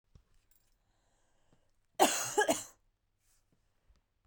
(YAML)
cough_length: 4.3 s
cough_amplitude: 9323
cough_signal_mean_std_ratio: 0.26
survey_phase: beta (2021-08-13 to 2022-03-07)
age: 18-44
gender: Female
wearing_mask: 'No'
symptom_cough_any: true
symptom_runny_or_blocked_nose: true
symptom_shortness_of_breath: true
symptom_sore_throat: true
symptom_fatigue: true
symptom_onset: 3 days
smoker_status: Ex-smoker
respiratory_condition_asthma: false
respiratory_condition_other: false
recruitment_source: Test and Trace
submission_delay: 1 day
covid_test_result: Positive
covid_test_method: RT-qPCR
covid_ct_value: 19.8
covid_ct_gene: ORF1ab gene
covid_ct_mean: 20.1
covid_viral_load: 250000 copies/ml
covid_viral_load_category: Low viral load (10K-1M copies/ml)